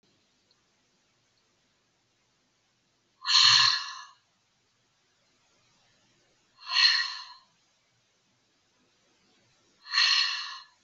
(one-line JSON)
{"exhalation_length": "10.8 s", "exhalation_amplitude": 15077, "exhalation_signal_mean_std_ratio": 0.3, "survey_phase": "beta (2021-08-13 to 2022-03-07)", "age": "65+", "gender": "Female", "wearing_mask": "No", "symptom_none": true, "smoker_status": "Ex-smoker", "respiratory_condition_asthma": false, "respiratory_condition_other": false, "recruitment_source": "REACT", "submission_delay": "1 day", "covid_test_result": "Negative", "covid_test_method": "RT-qPCR"}